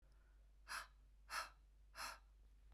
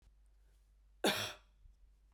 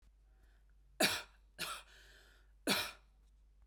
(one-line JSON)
{"exhalation_length": "2.7 s", "exhalation_amplitude": 672, "exhalation_signal_mean_std_ratio": 0.59, "cough_length": "2.1 s", "cough_amplitude": 4030, "cough_signal_mean_std_ratio": 0.32, "three_cough_length": "3.7 s", "three_cough_amplitude": 4399, "three_cough_signal_mean_std_ratio": 0.35, "survey_phase": "beta (2021-08-13 to 2022-03-07)", "age": "18-44", "gender": "Female", "wearing_mask": "No", "symptom_none": true, "smoker_status": "Never smoked", "respiratory_condition_asthma": false, "respiratory_condition_other": false, "recruitment_source": "REACT", "submission_delay": "0 days", "covid_test_result": "Negative", "covid_test_method": "RT-qPCR"}